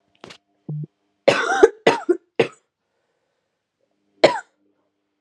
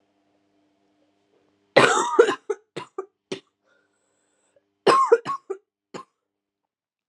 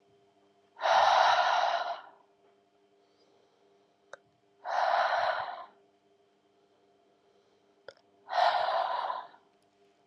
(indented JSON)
{
  "three_cough_length": "5.2 s",
  "three_cough_amplitude": 32767,
  "three_cough_signal_mean_std_ratio": 0.28,
  "cough_length": "7.1 s",
  "cough_amplitude": 31099,
  "cough_signal_mean_std_ratio": 0.29,
  "exhalation_length": "10.1 s",
  "exhalation_amplitude": 9422,
  "exhalation_signal_mean_std_ratio": 0.45,
  "survey_phase": "alpha (2021-03-01 to 2021-08-12)",
  "age": "18-44",
  "gender": "Female",
  "wearing_mask": "No",
  "symptom_cough_any": true,
  "symptom_change_to_sense_of_smell_or_taste": true,
  "symptom_loss_of_taste": true,
  "symptom_onset": "2 days",
  "smoker_status": "Ex-smoker",
  "respiratory_condition_asthma": false,
  "respiratory_condition_other": false,
  "recruitment_source": "Test and Trace",
  "submission_delay": "2 days",
  "covid_test_result": "Positive",
  "covid_test_method": "RT-qPCR",
  "covid_ct_value": 18.5,
  "covid_ct_gene": "ORF1ab gene",
  "covid_ct_mean": 18.9,
  "covid_viral_load": "630000 copies/ml",
  "covid_viral_load_category": "Low viral load (10K-1M copies/ml)"
}